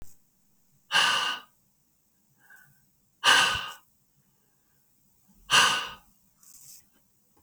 {"exhalation_length": "7.4 s", "exhalation_amplitude": 16338, "exhalation_signal_mean_std_ratio": 0.33, "survey_phase": "beta (2021-08-13 to 2022-03-07)", "age": "45-64", "gender": "Male", "wearing_mask": "No", "symptom_none": true, "smoker_status": "Ex-smoker", "respiratory_condition_asthma": false, "respiratory_condition_other": false, "recruitment_source": "REACT", "submission_delay": "-9 days", "covid_test_result": "Negative", "covid_test_method": "RT-qPCR", "influenza_a_test_result": "Unknown/Void", "influenza_b_test_result": "Unknown/Void"}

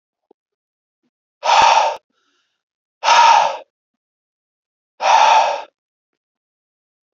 {"exhalation_length": "7.2 s", "exhalation_amplitude": 30351, "exhalation_signal_mean_std_ratio": 0.39, "survey_phase": "beta (2021-08-13 to 2022-03-07)", "age": "18-44", "gender": "Male", "wearing_mask": "No", "symptom_none": true, "smoker_status": "Never smoked", "respiratory_condition_asthma": false, "respiratory_condition_other": false, "recruitment_source": "REACT", "submission_delay": "0 days", "covid_test_result": "Negative", "covid_test_method": "RT-qPCR"}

